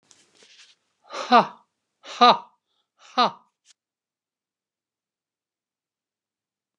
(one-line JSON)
{"exhalation_length": "6.8 s", "exhalation_amplitude": 26953, "exhalation_signal_mean_std_ratio": 0.2, "survey_phase": "beta (2021-08-13 to 2022-03-07)", "age": "65+", "gender": "Female", "wearing_mask": "No", "symptom_none": true, "smoker_status": "Never smoked", "respiratory_condition_asthma": true, "respiratory_condition_other": false, "recruitment_source": "REACT", "submission_delay": "1 day", "covid_test_result": "Negative", "covid_test_method": "RT-qPCR"}